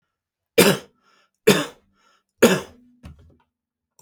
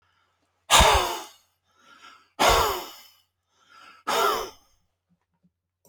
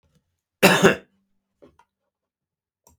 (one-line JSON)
{"three_cough_length": "4.0 s", "three_cough_amplitude": 32768, "three_cough_signal_mean_std_ratio": 0.27, "exhalation_length": "5.9 s", "exhalation_amplitude": 23748, "exhalation_signal_mean_std_ratio": 0.36, "cough_length": "3.0 s", "cough_amplitude": 29420, "cough_signal_mean_std_ratio": 0.24, "survey_phase": "beta (2021-08-13 to 2022-03-07)", "age": "65+", "gender": "Male", "wearing_mask": "No", "symptom_cough_any": true, "symptom_abdominal_pain": true, "symptom_onset": "11 days", "smoker_status": "Never smoked", "respiratory_condition_asthma": false, "respiratory_condition_other": false, "recruitment_source": "REACT", "submission_delay": "3 days", "covid_test_result": "Negative", "covid_test_method": "RT-qPCR"}